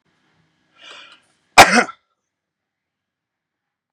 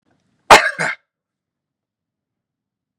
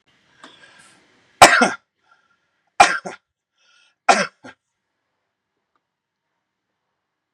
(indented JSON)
{
  "cough_length": "3.9 s",
  "cough_amplitude": 32768,
  "cough_signal_mean_std_ratio": 0.19,
  "exhalation_length": "3.0 s",
  "exhalation_amplitude": 32768,
  "exhalation_signal_mean_std_ratio": 0.21,
  "three_cough_length": "7.3 s",
  "three_cough_amplitude": 32768,
  "three_cough_signal_mean_std_ratio": 0.21,
  "survey_phase": "beta (2021-08-13 to 2022-03-07)",
  "age": "45-64",
  "gender": "Male",
  "wearing_mask": "No",
  "symptom_none": true,
  "smoker_status": "Never smoked",
  "respiratory_condition_asthma": false,
  "respiratory_condition_other": false,
  "recruitment_source": "REACT",
  "submission_delay": "0 days",
  "covid_test_result": "Negative",
  "covid_test_method": "RT-qPCR",
  "influenza_a_test_result": "Negative",
  "influenza_b_test_result": "Negative"
}